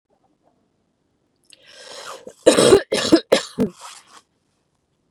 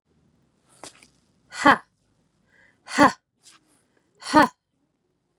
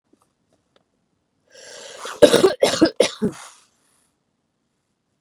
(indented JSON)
{
  "three_cough_length": "5.1 s",
  "three_cough_amplitude": 32767,
  "three_cough_signal_mean_std_ratio": 0.3,
  "exhalation_length": "5.4 s",
  "exhalation_amplitude": 28599,
  "exhalation_signal_mean_std_ratio": 0.22,
  "cough_length": "5.2 s",
  "cough_amplitude": 32768,
  "cough_signal_mean_std_ratio": 0.27,
  "survey_phase": "beta (2021-08-13 to 2022-03-07)",
  "age": "45-64",
  "gender": "Female",
  "wearing_mask": "No",
  "symptom_cough_any": true,
  "symptom_runny_or_blocked_nose": true,
  "smoker_status": "Never smoked",
  "respiratory_condition_asthma": false,
  "respiratory_condition_other": false,
  "recruitment_source": "REACT",
  "submission_delay": "2 days",
  "covid_test_result": "Negative",
  "covid_test_method": "RT-qPCR",
  "influenza_a_test_result": "Negative",
  "influenza_b_test_result": "Negative"
}